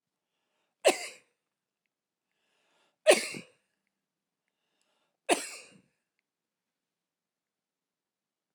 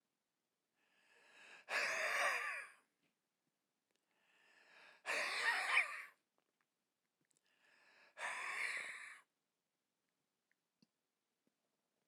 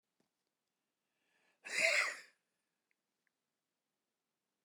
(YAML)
three_cough_length: 8.5 s
three_cough_amplitude: 14310
three_cough_signal_mean_std_ratio: 0.17
exhalation_length: 12.1 s
exhalation_amplitude: 2466
exhalation_signal_mean_std_ratio: 0.39
cough_length: 4.6 s
cough_amplitude: 3982
cough_signal_mean_std_ratio: 0.24
survey_phase: alpha (2021-03-01 to 2021-08-12)
age: 65+
gender: Male
wearing_mask: 'No'
symptom_none: true
smoker_status: Never smoked
respiratory_condition_asthma: false
respiratory_condition_other: false
recruitment_source: REACT
submission_delay: 1 day
covid_test_result: Negative
covid_test_method: RT-qPCR